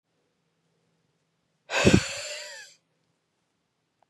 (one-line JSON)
{"exhalation_length": "4.1 s", "exhalation_amplitude": 22957, "exhalation_signal_mean_std_ratio": 0.25, "survey_phase": "beta (2021-08-13 to 2022-03-07)", "age": "18-44", "gender": "Female", "wearing_mask": "No", "symptom_cough_any": true, "symptom_runny_or_blocked_nose": true, "symptom_fatigue": true, "symptom_fever_high_temperature": true, "symptom_headache": true, "symptom_change_to_sense_of_smell_or_taste": true, "symptom_loss_of_taste": true, "symptom_onset": "5 days", "smoker_status": "Never smoked", "respiratory_condition_asthma": false, "respiratory_condition_other": false, "recruitment_source": "Test and Trace", "submission_delay": "1 day", "covid_test_result": "Positive", "covid_test_method": "RT-qPCR", "covid_ct_value": 13.4, "covid_ct_gene": "ORF1ab gene"}